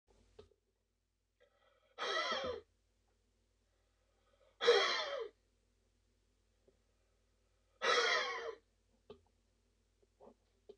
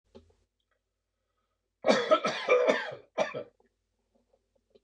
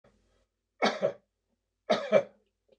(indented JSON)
{
  "exhalation_length": "10.8 s",
  "exhalation_amplitude": 4604,
  "exhalation_signal_mean_std_ratio": 0.32,
  "cough_length": "4.8 s",
  "cough_amplitude": 11537,
  "cough_signal_mean_std_ratio": 0.36,
  "three_cough_length": "2.8 s",
  "three_cough_amplitude": 9982,
  "three_cough_signal_mean_std_ratio": 0.32,
  "survey_phase": "beta (2021-08-13 to 2022-03-07)",
  "age": "65+",
  "gender": "Male",
  "wearing_mask": "No",
  "symptom_runny_or_blocked_nose": true,
  "smoker_status": "Never smoked",
  "respiratory_condition_asthma": false,
  "respiratory_condition_other": false,
  "recruitment_source": "REACT",
  "submission_delay": "5 days",
  "covid_test_result": "Negative",
  "covid_test_method": "RT-qPCR",
  "influenza_a_test_result": "Negative",
  "influenza_b_test_result": "Negative"
}